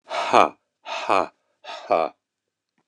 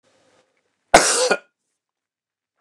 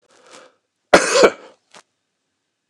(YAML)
exhalation_length: 2.9 s
exhalation_amplitude: 29204
exhalation_signal_mean_std_ratio: 0.35
three_cough_length: 2.6 s
three_cough_amplitude: 29204
three_cough_signal_mean_std_ratio: 0.28
cough_length: 2.7 s
cough_amplitude: 29204
cough_signal_mean_std_ratio: 0.28
survey_phase: beta (2021-08-13 to 2022-03-07)
age: 65+
gender: Male
wearing_mask: 'No'
symptom_none: true
smoker_status: Never smoked
respiratory_condition_asthma: false
respiratory_condition_other: false
recruitment_source: REACT
submission_delay: 2 days
covid_test_result: Negative
covid_test_method: RT-qPCR
influenza_a_test_result: Negative
influenza_b_test_result: Negative